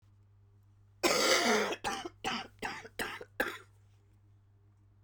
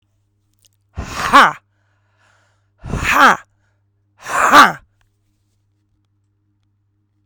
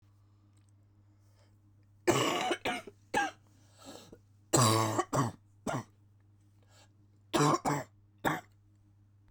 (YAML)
cough_length: 5.0 s
cough_amplitude: 7103
cough_signal_mean_std_ratio: 0.46
exhalation_length: 7.3 s
exhalation_amplitude: 32768
exhalation_signal_mean_std_ratio: 0.29
three_cough_length: 9.3 s
three_cough_amplitude: 7809
three_cough_signal_mean_std_ratio: 0.41
survey_phase: beta (2021-08-13 to 2022-03-07)
age: 18-44
gender: Female
wearing_mask: 'No'
symptom_cough_any: true
symptom_runny_or_blocked_nose: true
symptom_sore_throat: true
symptom_fatigue: true
symptom_headache: true
symptom_change_to_sense_of_smell_or_taste: true
symptom_loss_of_taste: true
symptom_onset: 6 days
smoker_status: Current smoker (e-cigarettes or vapes only)
respiratory_condition_asthma: false
respiratory_condition_other: false
recruitment_source: Test and Trace
submission_delay: 1 day
covid_test_result: Positive
covid_test_method: RT-qPCR